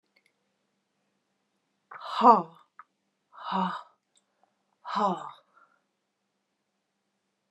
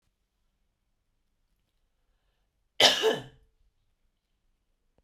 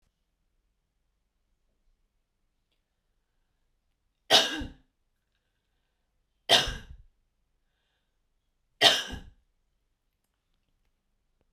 {
  "exhalation_length": "7.5 s",
  "exhalation_amplitude": 20544,
  "exhalation_signal_mean_std_ratio": 0.23,
  "cough_length": "5.0 s",
  "cough_amplitude": 17139,
  "cough_signal_mean_std_ratio": 0.2,
  "three_cough_length": "11.5 s",
  "three_cough_amplitude": 22940,
  "three_cough_signal_mean_std_ratio": 0.19,
  "survey_phase": "beta (2021-08-13 to 2022-03-07)",
  "age": "45-64",
  "gender": "Female",
  "wearing_mask": "No",
  "symptom_none": true,
  "smoker_status": "Never smoked",
  "respiratory_condition_asthma": false,
  "respiratory_condition_other": false,
  "recruitment_source": "REACT",
  "submission_delay": "2 days",
  "covid_test_result": "Negative",
  "covid_test_method": "RT-qPCR"
}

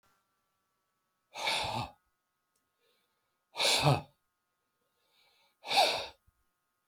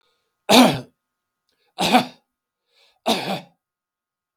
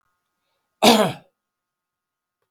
{
  "exhalation_length": "6.9 s",
  "exhalation_amplitude": 7841,
  "exhalation_signal_mean_std_ratio": 0.33,
  "three_cough_length": "4.4 s",
  "three_cough_amplitude": 32747,
  "three_cough_signal_mean_std_ratio": 0.31,
  "cough_length": "2.5 s",
  "cough_amplitude": 32768,
  "cough_signal_mean_std_ratio": 0.26,
  "survey_phase": "beta (2021-08-13 to 2022-03-07)",
  "age": "65+",
  "gender": "Male",
  "wearing_mask": "No",
  "symptom_none": true,
  "smoker_status": "Never smoked",
  "respiratory_condition_asthma": false,
  "respiratory_condition_other": false,
  "recruitment_source": "REACT",
  "submission_delay": "10 days",
  "covid_test_result": "Negative",
  "covid_test_method": "RT-qPCR",
  "influenza_a_test_result": "Negative",
  "influenza_b_test_result": "Negative"
}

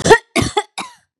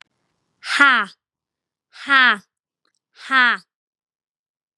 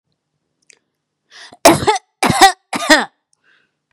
{
  "cough_length": "1.2 s",
  "cough_amplitude": 32768,
  "cough_signal_mean_std_ratio": 0.4,
  "exhalation_length": "4.8 s",
  "exhalation_amplitude": 32767,
  "exhalation_signal_mean_std_ratio": 0.3,
  "three_cough_length": "3.9 s",
  "three_cough_amplitude": 32768,
  "three_cough_signal_mean_std_ratio": 0.34,
  "survey_phase": "beta (2021-08-13 to 2022-03-07)",
  "age": "18-44",
  "gender": "Female",
  "wearing_mask": "No",
  "symptom_none": true,
  "smoker_status": "Never smoked",
  "respiratory_condition_asthma": false,
  "respiratory_condition_other": false,
  "recruitment_source": "REACT",
  "submission_delay": "2 days",
  "covid_test_result": "Negative",
  "covid_test_method": "RT-qPCR",
  "influenza_a_test_result": "Negative",
  "influenza_b_test_result": "Negative"
}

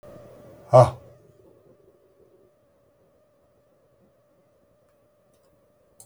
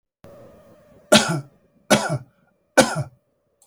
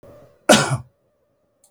{
  "exhalation_length": "6.1 s",
  "exhalation_amplitude": 26607,
  "exhalation_signal_mean_std_ratio": 0.15,
  "three_cough_length": "3.7 s",
  "three_cough_amplitude": 32768,
  "three_cough_signal_mean_std_ratio": 0.32,
  "cough_length": "1.7 s",
  "cough_amplitude": 32768,
  "cough_signal_mean_std_ratio": 0.3,
  "survey_phase": "beta (2021-08-13 to 2022-03-07)",
  "age": "65+",
  "gender": "Male",
  "wearing_mask": "No",
  "symptom_none": true,
  "smoker_status": "Never smoked",
  "respiratory_condition_asthma": false,
  "respiratory_condition_other": false,
  "recruitment_source": "REACT",
  "submission_delay": "1 day",
  "covid_test_result": "Negative",
  "covid_test_method": "RT-qPCR",
  "influenza_a_test_result": "Negative",
  "influenza_b_test_result": "Negative"
}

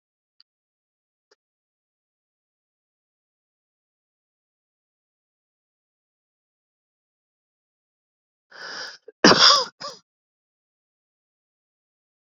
{
  "cough_length": "12.4 s",
  "cough_amplitude": 29749,
  "cough_signal_mean_std_ratio": 0.15,
  "survey_phase": "beta (2021-08-13 to 2022-03-07)",
  "age": "18-44",
  "gender": "Male",
  "wearing_mask": "No",
  "symptom_cough_any": true,
  "symptom_runny_or_blocked_nose": true,
  "symptom_sore_throat": true,
  "symptom_headache": true,
  "symptom_change_to_sense_of_smell_or_taste": true,
  "symptom_loss_of_taste": true,
  "symptom_onset": "4 days",
  "smoker_status": "Ex-smoker",
  "respiratory_condition_asthma": true,
  "respiratory_condition_other": false,
  "recruitment_source": "Test and Trace",
  "submission_delay": "1 day",
  "covid_test_result": "Positive",
  "covid_test_method": "RT-qPCR",
  "covid_ct_value": 19.7,
  "covid_ct_gene": "N gene",
  "covid_ct_mean": 20.3,
  "covid_viral_load": "210000 copies/ml",
  "covid_viral_load_category": "Low viral load (10K-1M copies/ml)"
}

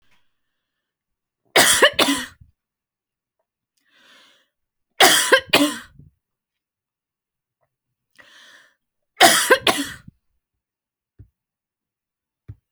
{
  "three_cough_length": "12.7 s",
  "three_cough_amplitude": 32768,
  "three_cough_signal_mean_std_ratio": 0.27,
  "survey_phase": "alpha (2021-03-01 to 2021-08-12)",
  "age": "45-64",
  "gender": "Female",
  "wearing_mask": "No",
  "symptom_none": true,
  "smoker_status": "Never smoked",
  "respiratory_condition_asthma": false,
  "respiratory_condition_other": false,
  "recruitment_source": "REACT",
  "submission_delay": "1 day",
  "covid_test_result": "Negative",
  "covid_test_method": "RT-qPCR"
}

